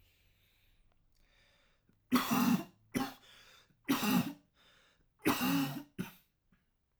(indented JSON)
{
  "three_cough_length": "7.0 s",
  "three_cough_amplitude": 5375,
  "three_cough_signal_mean_std_ratio": 0.41,
  "survey_phase": "alpha (2021-03-01 to 2021-08-12)",
  "age": "18-44",
  "gender": "Male",
  "wearing_mask": "No",
  "symptom_none": true,
  "symptom_cough_any": true,
  "symptom_headache": true,
  "smoker_status": "Current smoker (1 to 10 cigarettes per day)",
  "respiratory_condition_asthma": false,
  "respiratory_condition_other": false,
  "recruitment_source": "REACT",
  "submission_delay": "1 day",
  "covid_test_result": "Negative",
  "covid_test_method": "RT-qPCR"
}